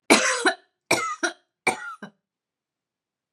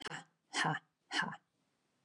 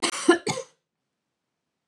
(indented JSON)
{
  "three_cough_length": "3.3 s",
  "three_cough_amplitude": 28181,
  "three_cough_signal_mean_std_ratio": 0.38,
  "exhalation_length": "2.0 s",
  "exhalation_amplitude": 2730,
  "exhalation_signal_mean_std_ratio": 0.43,
  "cough_length": "1.9 s",
  "cough_amplitude": 18630,
  "cough_signal_mean_std_ratio": 0.31,
  "survey_phase": "beta (2021-08-13 to 2022-03-07)",
  "age": "45-64",
  "gender": "Female",
  "wearing_mask": "No",
  "symptom_none": true,
  "smoker_status": "Never smoked",
  "respiratory_condition_asthma": false,
  "respiratory_condition_other": false,
  "recruitment_source": "REACT",
  "submission_delay": "2 days",
  "covid_test_result": "Negative",
  "covid_test_method": "RT-qPCR",
  "influenza_a_test_result": "Negative",
  "influenza_b_test_result": "Negative"
}